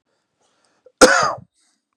{"cough_length": "2.0 s", "cough_amplitude": 32768, "cough_signal_mean_std_ratio": 0.29, "survey_phase": "beta (2021-08-13 to 2022-03-07)", "age": "18-44", "gender": "Male", "wearing_mask": "No", "symptom_none": true, "smoker_status": "Never smoked", "respiratory_condition_asthma": false, "respiratory_condition_other": false, "recruitment_source": "REACT", "submission_delay": "2 days", "covid_test_result": "Negative", "covid_test_method": "RT-qPCR", "influenza_a_test_result": "Negative", "influenza_b_test_result": "Negative"}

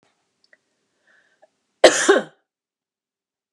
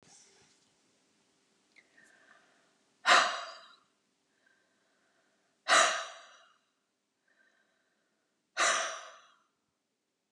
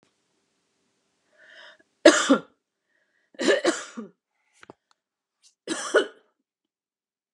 {"cough_length": "3.5 s", "cough_amplitude": 32768, "cough_signal_mean_std_ratio": 0.22, "exhalation_length": "10.3 s", "exhalation_amplitude": 10804, "exhalation_signal_mean_std_ratio": 0.25, "three_cough_length": "7.3 s", "three_cough_amplitude": 31323, "three_cough_signal_mean_std_ratio": 0.25, "survey_phase": "beta (2021-08-13 to 2022-03-07)", "age": "45-64", "gender": "Female", "wearing_mask": "No", "symptom_cough_any": true, "smoker_status": "Ex-smoker", "respiratory_condition_asthma": false, "respiratory_condition_other": false, "recruitment_source": "REACT", "submission_delay": "1 day", "covid_test_result": "Negative", "covid_test_method": "RT-qPCR"}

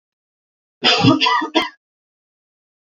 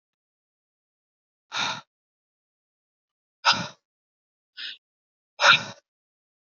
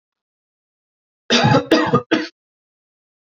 {"cough_length": "3.0 s", "cough_amplitude": 28007, "cough_signal_mean_std_ratio": 0.4, "exhalation_length": "6.6 s", "exhalation_amplitude": 23077, "exhalation_signal_mean_std_ratio": 0.22, "three_cough_length": "3.3 s", "three_cough_amplitude": 28361, "three_cough_signal_mean_std_ratio": 0.37, "survey_phase": "beta (2021-08-13 to 2022-03-07)", "age": "18-44", "gender": "Female", "wearing_mask": "No", "symptom_abdominal_pain": true, "symptom_onset": "12 days", "smoker_status": "Never smoked", "respiratory_condition_asthma": false, "respiratory_condition_other": false, "recruitment_source": "REACT", "submission_delay": "4 days", "covid_test_result": "Negative", "covid_test_method": "RT-qPCR", "influenza_a_test_result": "Negative", "influenza_b_test_result": "Negative"}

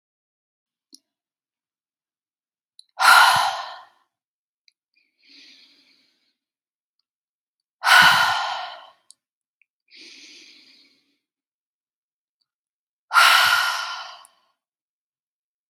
{"exhalation_length": "15.7 s", "exhalation_amplitude": 31196, "exhalation_signal_mean_std_ratio": 0.28, "survey_phase": "beta (2021-08-13 to 2022-03-07)", "age": "18-44", "gender": "Female", "wearing_mask": "No", "symptom_none": true, "smoker_status": "Never smoked", "respiratory_condition_asthma": false, "respiratory_condition_other": false, "recruitment_source": "REACT", "submission_delay": "1 day", "covid_test_method": "RT-qPCR"}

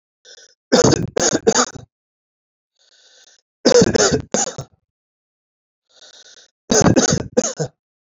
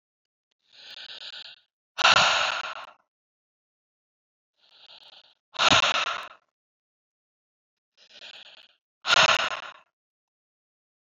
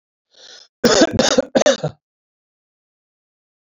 {"three_cough_length": "8.2 s", "three_cough_amplitude": 32768, "three_cough_signal_mean_std_ratio": 0.39, "exhalation_length": "11.1 s", "exhalation_amplitude": 20054, "exhalation_signal_mean_std_ratio": 0.31, "cough_length": "3.7 s", "cough_amplitude": 32768, "cough_signal_mean_std_ratio": 0.35, "survey_phase": "alpha (2021-03-01 to 2021-08-12)", "age": "45-64", "gender": "Male", "wearing_mask": "No", "symptom_none": true, "smoker_status": "Ex-smoker", "respiratory_condition_asthma": false, "respiratory_condition_other": false, "recruitment_source": "REACT", "submission_delay": "1 day", "covid_test_result": "Negative", "covid_test_method": "RT-qPCR"}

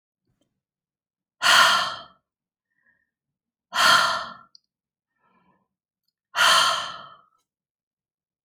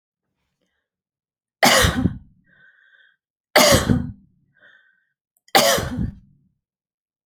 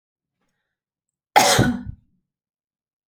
{"exhalation_length": "8.4 s", "exhalation_amplitude": 24638, "exhalation_signal_mean_std_ratio": 0.33, "three_cough_length": "7.3 s", "three_cough_amplitude": 32005, "three_cough_signal_mean_std_ratio": 0.34, "cough_length": "3.1 s", "cough_amplitude": 29568, "cough_signal_mean_std_ratio": 0.29, "survey_phase": "beta (2021-08-13 to 2022-03-07)", "age": "65+", "gender": "Male", "wearing_mask": "No", "symptom_none": true, "smoker_status": "Never smoked", "respiratory_condition_asthma": false, "respiratory_condition_other": false, "recruitment_source": "Test and Trace", "submission_delay": "8 days", "covid_test_result": "Negative", "covid_test_method": "RT-qPCR"}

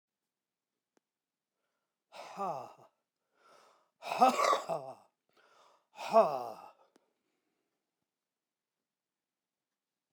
{"exhalation_length": "10.1 s", "exhalation_amplitude": 8280, "exhalation_signal_mean_std_ratio": 0.25, "survey_phase": "beta (2021-08-13 to 2022-03-07)", "age": "65+", "gender": "Male", "wearing_mask": "No", "symptom_none": true, "smoker_status": "Ex-smoker", "respiratory_condition_asthma": true, "respiratory_condition_other": false, "recruitment_source": "REACT", "submission_delay": "1 day", "covid_test_result": "Negative", "covid_test_method": "RT-qPCR"}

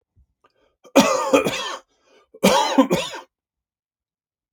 {"cough_length": "4.5 s", "cough_amplitude": 32181, "cough_signal_mean_std_ratio": 0.4, "survey_phase": "alpha (2021-03-01 to 2021-08-12)", "age": "45-64", "gender": "Male", "wearing_mask": "No", "symptom_none": true, "smoker_status": "Ex-smoker", "respiratory_condition_asthma": false, "respiratory_condition_other": false, "recruitment_source": "REACT", "submission_delay": "2 days", "covid_test_result": "Negative", "covid_test_method": "RT-qPCR"}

